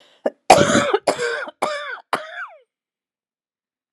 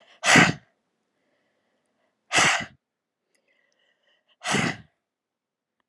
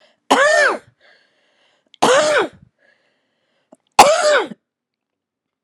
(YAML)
cough_length: 3.9 s
cough_amplitude: 32768
cough_signal_mean_std_ratio: 0.39
exhalation_length: 5.9 s
exhalation_amplitude: 24040
exhalation_signal_mean_std_ratio: 0.28
three_cough_length: 5.6 s
three_cough_amplitude: 32768
three_cough_signal_mean_std_ratio: 0.4
survey_phase: alpha (2021-03-01 to 2021-08-12)
age: 45-64
gender: Female
wearing_mask: 'No'
symptom_cough_any: true
symptom_shortness_of_breath: true
symptom_diarrhoea: true
symptom_fatigue: true
symptom_change_to_sense_of_smell_or_taste: true
symptom_loss_of_taste: true
symptom_onset: 5 days
smoker_status: Never smoked
respiratory_condition_asthma: false
respiratory_condition_other: false
recruitment_source: Test and Trace
submission_delay: 4 days
covid_test_result: Positive
covid_test_method: RT-qPCR
covid_ct_value: 17.2
covid_ct_gene: ORF1ab gene
covid_ct_mean: 17.6
covid_viral_load: 1600000 copies/ml
covid_viral_load_category: High viral load (>1M copies/ml)